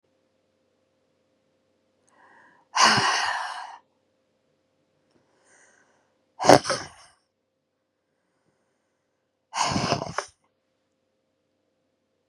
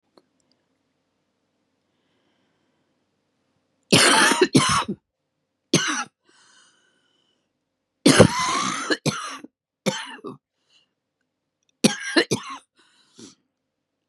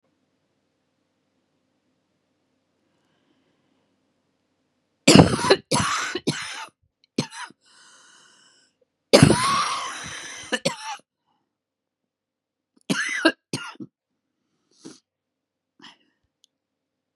{"exhalation_length": "12.3 s", "exhalation_amplitude": 32767, "exhalation_signal_mean_std_ratio": 0.24, "three_cough_length": "14.1 s", "three_cough_amplitude": 32768, "three_cough_signal_mean_std_ratio": 0.31, "cough_length": "17.2 s", "cough_amplitude": 32768, "cough_signal_mean_std_ratio": 0.26, "survey_phase": "beta (2021-08-13 to 2022-03-07)", "age": "45-64", "gender": "Female", "wearing_mask": "No", "symptom_cough_any": true, "symptom_runny_or_blocked_nose": true, "symptom_sore_throat": true, "symptom_fatigue": true, "symptom_headache": true, "smoker_status": "Ex-smoker", "respiratory_condition_asthma": false, "respiratory_condition_other": false, "recruitment_source": "Test and Trace", "submission_delay": "2 days", "covid_test_result": "Positive", "covid_test_method": "LFT"}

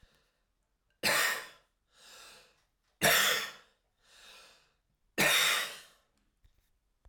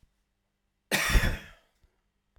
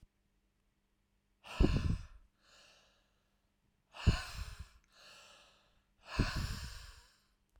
{"three_cough_length": "7.1 s", "three_cough_amplitude": 8267, "three_cough_signal_mean_std_ratio": 0.37, "cough_length": "2.4 s", "cough_amplitude": 10936, "cough_signal_mean_std_ratio": 0.33, "exhalation_length": "7.6 s", "exhalation_amplitude": 5175, "exhalation_signal_mean_std_ratio": 0.31, "survey_phase": "alpha (2021-03-01 to 2021-08-12)", "age": "45-64", "gender": "Male", "wearing_mask": "No", "symptom_none": true, "smoker_status": "Never smoked", "respiratory_condition_asthma": true, "respiratory_condition_other": false, "recruitment_source": "REACT", "submission_delay": "3 days", "covid_test_result": "Negative", "covid_test_method": "RT-qPCR"}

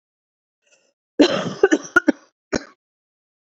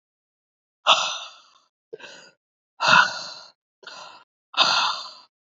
{"cough_length": "3.6 s", "cough_amplitude": 28366, "cough_signal_mean_std_ratio": 0.28, "exhalation_length": "5.5 s", "exhalation_amplitude": 27176, "exhalation_signal_mean_std_ratio": 0.35, "survey_phase": "beta (2021-08-13 to 2022-03-07)", "age": "45-64", "gender": "Female", "wearing_mask": "No", "symptom_cough_any": true, "symptom_runny_or_blocked_nose": true, "symptom_sore_throat": true, "symptom_fatigue": true, "symptom_headache": true, "smoker_status": "Ex-smoker", "respiratory_condition_asthma": false, "respiratory_condition_other": false, "recruitment_source": "Test and Trace", "submission_delay": "2 days", "covid_test_result": "Positive", "covid_test_method": "RT-qPCR", "covid_ct_value": 24.1, "covid_ct_gene": "ORF1ab gene"}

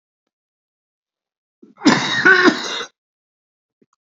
{"cough_length": "4.0 s", "cough_amplitude": 29961, "cough_signal_mean_std_ratio": 0.34, "survey_phase": "beta (2021-08-13 to 2022-03-07)", "age": "65+", "gender": "Male", "wearing_mask": "No", "symptom_cough_any": true, "symptom_runny_or_blocked_nose": true, "symptom_onset": "11 days", "smoker_status": "Ex-smoker", "respiratory_condition_asthma": true, "respiratory_condition_other": false, "recruitment_source": "REACT", "submission_delay": "2 days", "covid_test_result": "Positive", "covid_test_method": "RT-qPCR", "covid_ct_value": 26.6, "covid_ct_gene": "E gene", "influenza_a_test_result": "Negative", "influenza_b_test_result": "Negative"}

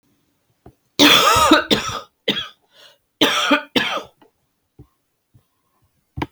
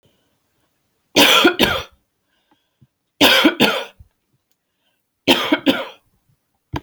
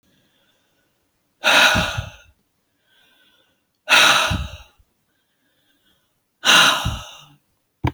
{"cough_length": "6.3 s", "cough_amplitude": 32767, "cough_signal_mean_std_ratio": 0.4, "three_cough_length": "6.8 s", "three_cough_amplitude": 31466, "three_cough_signal_mean_std_ratio": 0.38, "exhalation_length": "7.9 s", "exhalation_amplitude": 32768, "exhalation_signal_mean_std_ratio": 0.36, "survey_phase": "beta (2021-08-13 to 2022-03-07)", "age": "45-64", "gender": "Female", "wearing_mask": "No", "symptom_runny_or_blocked_nose": true, "smoker_status": "Ex-smoker", "respiratory_condition_asthma": false, "respiratory_condition_other": false, "recruitment_source": "REACT", "submission_delay": "1 day", "covid_test_result": "Negative", "covid_test_method": "RT-qPCR", "influenza_a_test_result": "Negative", "influenza_b_test_result": "Negative"}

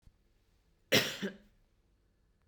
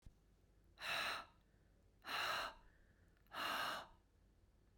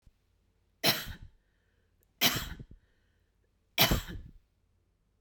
{"cough_length": "2.5 s", "cough_amplitude": 7881, "cough_signal_mean_std_ratio": 0.26, "exhalation_length": "4.8 s", "exhalation_amplitude": 928, "exhalation_signal_mean_std_ratio": 0.52, "three_cough_length": "5.2 s", "three_cough_amplitude": 15036, "three_cough_signal_mean_std_ratio": 0.3, "survey_phase": "beta (2021-08-13 to 2022-03-07)", "age": "45-64", "gender": "Female", "wearing_mask": "No", "symptom_none": true, "symptom_onset": "12 days", "smoker_status": "Never smoked", "respiratory_condition_asthma": false, "respiratory_condition_other": false, "recruitment_source": "REACT", "submission_delay": "1 day", "covid_test_result": "Negative", "covid_test_method": "RT-qPCR", "influenza_a_test_result": "Negative", "influenza_b_test_result": "Negative"}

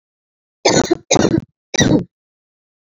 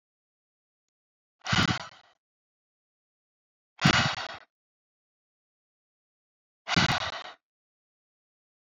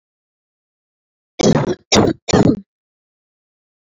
{"three_cough_length": "2.8 s", "three_cough_amplitude": 32574, "three_cough_signal_mean_std_ratio": 0.42, "exhalation_length": "8.6 s", "exhalation_amplitude": 13415, "exhalation_signal_mean_std_ratio": 0.27, "cough_length": "3.8 s", "cough_amplitude": 32767, "cough_signal_mean_std_ratio": 0.35, "survey_phase": "alpha (2021-03-01 to 2021-08-12)", "age": "18-44", "gender": "Female", "wearing_mask": "No", "symptom_none": true, "symptom_onset": "5 days", "smoker_status": "Current smoker (e-cigarettes or vapes only)", "respiratory_condition_asthma": false, "respiratory_condition_other": false, "recruitment_source": "REACT", "submission_delay": "2 days", "covid_test_result": "Negative", "covid_test_method": "RT-qPCR"}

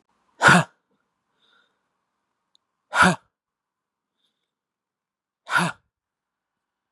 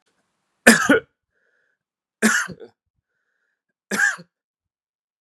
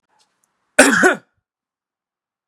{"exhalation_length": "6.9 s", "exhalation_amplitude": 28951, "exhalation_signal_mean_std_ratio": 0.22, "three_cough_length": "5.2 s", "three_cough_amplitude": 32768, "three_cough_signal_mean_std_ratio": 0.28, "cough_length": "2.5 s", "cough_amplitude": 32768, "cough_signal_mean_std_ratio": 0.29, "survey_phase": "beta (2021-08-13 to 2022-03-07)", "age": "18-44", "gender": "Male", "wearing_mask": "No", "symptom_none": true, "smoker_status": "Never smoked", "respiratory_condition_asthma": false, "respiratory_condition_other": false, "recruitment_source": "REACT", "submission_delay": "3 days", "covid_test_result": "Negative", "covid_test_method": "RT-qPCR"}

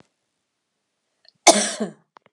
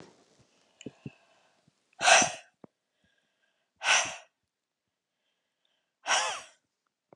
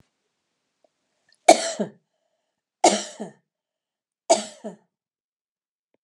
{"cough_length": "2.3 s", "cough_amplitude": 32768, "cough_signal_mean_std_ratio": 0.24, "exhalation_length": "7.2 s", "exhalation_amplitude": 15157, "exhalation_signal_mean_std_ratio": 0.26, "three_cough_length": "6.0 s", "three_cough_amplitude": 32768, "three_cough_signal_mean_std_ratio": 0.21, "survey_phase": "beta (2021-08-13 to 2022-03-07)", "age": "65+", "gender": "Female", "wearing_mask": "No", "symptom_cough_any": true, "smoker_status": "Never smoked", "respiratory_condition_asthma": false, "respiratory_condition_other": false, "recruitment_source": "REACT", "submission_delay": "1 day", "covid_test_result": "Negative", "covid_test_method": "RT-qPCR", "influenza_a_test_result": "Negative", "influenza_b_test_result": "Negative"}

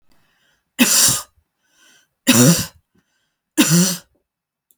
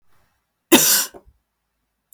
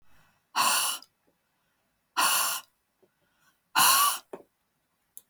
{"three_cough_length": "4.8 s", "three_cough_amplitude": 32768, "three_cough_signal_mean_std_ratio": 0.39, "cough_length": "2.1 s", "cough_amplitude": 32768, "cough_signal_mean_std_ratio": 0.31, "exhalation_length": "5.3 s", "exhalation_amplitude": 12979, "exhalation_signal_mean_std_ratio": 0.4, "survey_phase": "beta (2021-08-13 to 2022-03-07)", "age": "45-64", "gender": "Female", "wearing_mask": "No", "symptom_none": true, "smoker_status": "Ex-smoker", "respiratory_condition_asthma": false, "respiratory_condition_other": false, "recruitment_source": "REACT", "submission_delay": "2 days", "covid_test_result": "Negative", "covid_test_method": "RT-qPCR", "influenza_a_test_result": "Negative", "influenza_b_test_result": "Negative"}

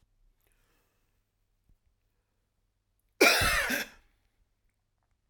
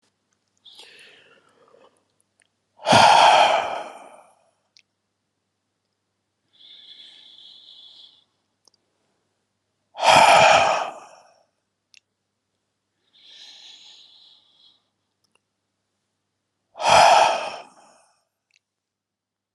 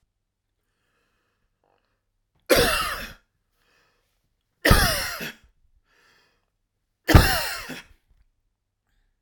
{"cough_length": "5.3 s", "cough_amplitude": 14105, "cough_signal_mean_std_ratio": 0.26, "exhalation_length": "19.5 s", "exhalation_amplitude": 29822, "exhalation_signal_mean_std_ratio": 0.29, "three_cough_length": "9.2 s", "three_cough_amplitude": 32768, "three_cough_signal_mean_std_ratio": 0.28, "survey_phase": "alpha (2021-03-01 to 2021-08-12)", "age": "45-64", "gender": "Male", "wearing_mask": "No", "symptom_none": true, "smoker_status": "Never smoked", "respiratory_condition_asthma": false, "respiratory_condition_other": false, "recruitment_source": "REACT", "submission_delay": "10 days", "covid_test_result": "Negative", "covid_test_method": "RT-qPCR"}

